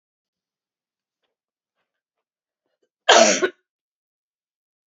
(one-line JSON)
{"cough_length": "4.9 s", "cough_amplitude": 29917, "cough_signal_mean_std_ratio": 0.21, "survey_phase": "beta (2021-08-13 to 2022-03-07)", "age": "65+", "gender": "Female", "wearing_mask": "No", "symptom_runny_or_blocked_nose": true, "symptom_change_to_sense_of_smell_or_taste": true, "symptom_onset": "2 days", "smoker_status": "Never smoked", "respiratory_condition_asthma": false, "respiratory_condition_other": false, "recruitment_source": "Test and Trace", "submission_delay": "1 day", "covid_test_result": "Positive", "covid_test_method": "RT-qPCR", "covid_ct_value": 18.9, "covid_ct_gene": "N gene"}